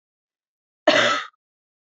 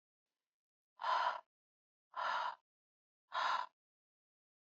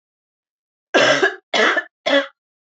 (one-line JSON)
{"cough_length": "1.9 s", "cough_amplitude": 25322, "cough_signal_mean_std_ratio": 0.34, "exhalation_length": "4.6 s", "exhalation_amplitude": 1807, "exhalation_signal_mean_std_ratio": 0.39, "three_cough_length": "2.6 s", "three_cough_amplitude": 26046, "three_cough_signal_mean_std_ratio": 0.47, "survey_phase": "beta (2021-08-13 to 2022-03-07)", "age": "18-44", "gender": "Female", "wearing_mask": "No", "symptom_cough_any": true, "symptom_runny_or_blocked_nose": true, "symptom_abdominal_pain": true, "symptom_fatigue": true, "symptom_headache": true, "smoker_status": "Never smoked", "respiratory_condition_asthma": false, "respiratory_condition_other": false, "recruitment_source": "REACT", "submission_delay": "1 day", "covid_test_result": "Negative", "covid_test_method": "RT-qPCR", "influenza_a_test_result": "Positive", "influenza_a_ct_value": 33.7, "influenza_b_test_result": "Positive", "influenza_b_ct_value": 34.6}